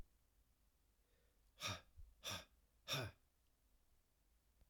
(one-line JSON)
{"exhalation_length": "4.7 s", "exhalation_amplitude": 933, "exhalation_signal_mean_std_ratio": 0.35, "survey_phase": "beta (2021-08-13 to 2022-03-07)", "age": "18-44", "gender": "Male", "wearing_mask": "No", "symptom_cough_any": true, "symptom_runny_or_blocked_nose": true, "symptom_fatigue": true, "symptom_fever_high_temperature": true, "symptom_loss_of_taste": true, "symptom_onset": "3 days", "smoker_status": "Never smoked", "respiratory_condition_asthma": false, "respiratory_condition_other": false, "recruitment_source": "Test and Trace", "submission_delay": "2 days", "covid_test_result": "Positive", "covid_test_method": "RT-qPCR"}